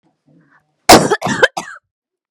cough_length: 2.3 s
cough_amplitude: 32768
cough_signal_mean_std_ratio: 0.34
survey_phase: beta (2021-08-13 to 2022-03-07)
age: 18-44
gender: Female
wearing_mask: 'No'
symptom_none: true
smoker_status: Never smoked
respiratory_condition_asthma: false
respiratory_condition_other: false
recruitment_source: REACT
submission_delay: 3 days
covid_test_result: Negative
covid_test_method: RT-qPCR
influenza_a_test_result: Negative
influenza_b_test_result: Negative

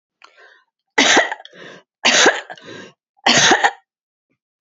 three_cough_length: 4.6 s
three_cough_amplitude: 32767
three_cough_signal_mean_std_ratio: 0.41
survey_phase: beta (2021-08-13 to 2022-03-07)
age: 65+
gender: Female
wearing_mask: 'No'
symptom_runny_or_blocked_nose: true
symptom_onset: 5 days
smoker_status: Never smoked
respiratory_condition_asthma: false
respiratory_condition_other: false
recruitment_source: REACT
submission_delay: 3 days
covid_test_result: Negative
covid_test_method: RT-qPCR
influenza_a_test_result: Negative
influenza_b_test_result: Negative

